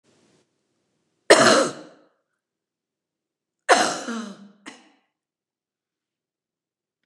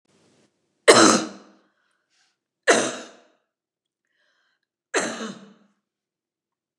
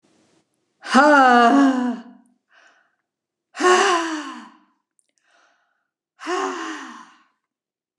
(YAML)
cough_length: 7.1 s
cough_amplitude: 29204
cough_signal_mean_std_ratio: 0.25
three_cough_length: 6.8 s
three_cough_amplitude: 29204
three_cough_signal_mean_std_ratio: 0.25
exhalation_length: 8.0 s
exhalation_amplitude: 29203
exhalation_signal_mean_std_ratio: 0.4
survey_phase: beta (2021-08-13 to 2022-03-07)
age: 65+
gender: Female
wearing_mask: 'No'
symptom_none: true
smoker_status: Never smoked
respiratory_condition_asthma: false
respiratory_condition_other: false
recruitment_source: REACT
submission_delay: 1 day
covid_test_result: Negative
covid_test_method: RT-qPCR
influenza_a_test_result: Negative
influenza_b_test_result: Negative